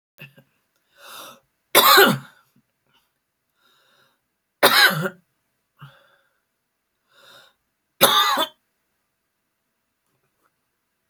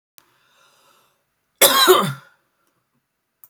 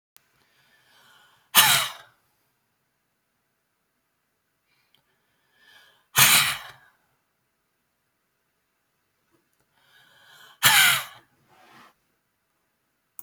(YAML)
three_cough_length: 11.1 s
three_cough_amplitude: 32768
three_cough_signal_mean_std_ratio: 0.27
cough_length: 3.5 s
cough_amplitude: 32768
cough_signal_mean_std_ratio: 0.3
exhalation_length: 13.2 s
exhalation_amplitude: 32767
exhalation_signal_mean_std_ratio: 0.23
survey_phase: beta (2021-08-13 to 2022-03-07)
age: 45-64
gender: Female
wearing_mask: 'No'
symptom_runny_or_blocked_nose: true
smoker_status: Never smoked
respiratory_condition_asthma: true
respiratory_condition_other: false
recruitment_source: REACT
submission_delay: 2 days
covid_test_result: Negative
covid_test_method: RT-qPCR